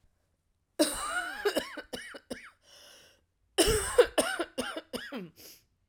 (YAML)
cough_length: 5.9 s
cough_amplitude: 11381
cough_signal_mean_std_ratio: 0.41
survey_phase: alpha (2021-03-01 to 2021-08-12)
age: 45-64
gender: Female
wearing_mask: 'No'
symptom_cough_any: true
symptom_new_continuous_cough: true
symptom_shortness_of_breath: true
symptom_fatigue: true
symptom_headache: true
smoker_status: Never smoked
respiratory_condition_asthma: false
respiratory_condition_other: false
recruitment_source: Test and Trace
submission_delay: 1 day
covid_test_result: Positive
covid_test_method: RT-qPCR
covid_ct_value: 32.3
covid_ct_gene: N gene